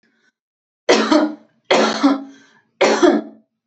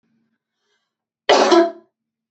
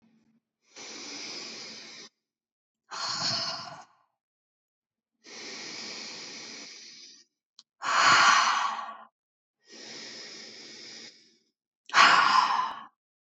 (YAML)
three_cough_length: 3.7 s
three_cough_amplitude: 29483
three_cough_signal_mean_std_ratio: 0.5
cough_length: 2.3 s
cough_amplitude: 29247
cough_signal_mean_std_ratio: 0.34
exhalation_length: 13.2 s
exhalation_amplitude: 19429
exhalation_signal_mean_std_ratio: 0.39
survey_phase: beta (2021-08-13 to 2022-03-07)
age: 18-44
gender: Female
wearing_mask: 'No'
symptom_none: true
smoker_status: Never smoked
respiratory_condition_asthma: true
respiratory_condition_other: false
recruitment_source: REACT
submission_delay: 1 day
covid_test_result: Negative
covid_test_method: RT-qPCR
influenza_a_test_result: Negative
influenza_b_test_result: Negative